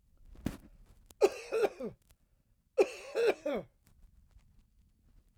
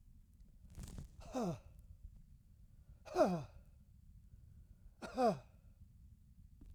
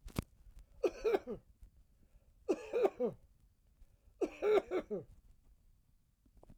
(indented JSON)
{
  "cough_length": "5.4 s",
  "cough_amplitude": 7378,
  "cough_signal_mean_std_ratio": 0.34,
  "exhalation_length": "6.7 s",
  "exhalation_amplitude": 3420,
  "exhalation_signal_mean_std_ratio": 0.38,
  "three_cough_length": "6.6 s",
  "three_cough_amplitude": 4366,
  "three_cough_signal_mean_std_ratio": 0.39,
  "survey_phase": "alpha (2021-03-01 to 2021-08-12)",
  "age": "65+",
  "gender": "Male",
  "wearing_mask": "No",
  "symptom_none": true,
  "smoker_status": "Never smoked",
  "respiratory_condition_asthma": true,
  "respiratory_condition_other": true,
  "recruitment_source": "REACT",
  "submission_delay": "1 day",
  "covid_test_result": "Negative",
  "covid_test_method": "RT-qPCR"
}